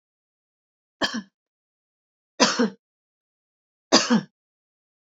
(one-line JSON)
{"three_cough_length": "5.0 s", "three_cough_amplitude": 29671, "three_cough_signal_mean_std_ratio": 0.27, "survey_phase": "alpha (2021-03-01 to 2021-08-12)", "age": "45-64", "gender": "Female", "wearing_mask": "No", "symptom_none": true, "smoker_status": "Never smoked", "respiratory_condition_asthma": false, "respiratory_condition_other": false, "recruitment_source": "REACT", "submission_delay": "4 days", "covid_test_result": "Negative", "covid_test_method": "RT-qPCR"}